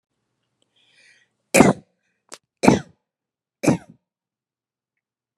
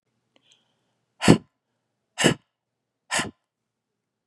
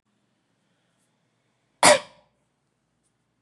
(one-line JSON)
{"three_cough_length": "5.4 s", "three_cough_amplitude": 32768, "three_cough_signal_mean_std_ratio": 0.22, "exhalation_length": "4.3 s", "exhalation_amplitude": 32768, "exhalation_signal_mean_std_ratio": 0.21, "cough_length": "3.4 s", "cough_amplitude": 27296, "cough_signal_mean_std_ratio": 0.17, "survey_phase": "beta (2021-08-13 to 2022-03-07)", "age": "45-64", "gender": "Female", "wearing_mask": "No", "symptom_none": true, "smoker_status": "Never smoked", "respiratory_condition_asthma": false, "respiratory_condition_other": false, "recruitment_source": "REACT", "submission_delay": "1 day", "covid_test_result": "Negative", "covid_test_method": "RT-qPCR"}